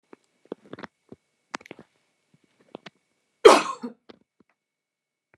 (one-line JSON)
{"cough_length": "5.4 s", "cough_amplitude": 29204, "cough_signal_mean_std_ratio": 0.15, "survey_phase": "beta (2021-08-13 to 2022-03-07)", "age": "45-64", "gender": "Female", "wearing_mask": "No", "symptom_none": true, "smoker_status": "Never smoked", "respiratory_condition_asthma": false, "respiratory_condition_other": false, "recruitment_source": "REACT", "submission_delay": "3 days", "covid_test_result": "Negative", "covid_test_method": "RT-qPCR"}